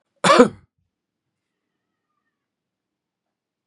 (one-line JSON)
{"cough_length": "3.7 s", "cough_amplitude": 32767, "cough_signal_mean_std_ratio": 0.19, "survey_phase": "beta (2021-08-13 to 2022-03-07)", "age": "65+", "gender": "Male", "wearing_mask": "No", "symptom_sore_throat": true, "symptom_onset": "8 days", "smoker_status": "Ex-smoker", "respiratory_condition_asthma": false, "respiratory_condition_other": false, "recruitment_source": "REACT", "submission_delay": "2 days", "covid_test_result": "Negative", "covid_test_method": "RT-qPCR", "influenza_a_test_result": "Negative", "influenza_b_test_result": "Negative"}